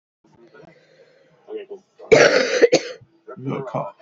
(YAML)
cough_length: 4.0 s
cough_amplitude: 29349
cough_signal_mean_std_ratio: 0.38
survey_phase: alpha (2021-03-01 to 2021-08-12)
age: 18-44
gender: Female
wearing_mask: 'No'
symptom_cough_any: true
symptom_new_continuous_cough: true
symptom_shortness_of_breath: true
symptom_abdominal_pain: true
symptom_diarrhoea: true
symptom_fatigue: true
symptom_fever_high_temperature: true
symptom_headache: true
smoker_status: Never smoked
respiratory_condition_asthma: false
respiratory_condition_other: false
recruitment_source: Test and Trace
submission_delay: 2 days
covid_test_result: Positive
covid_test_method: RT-qPCR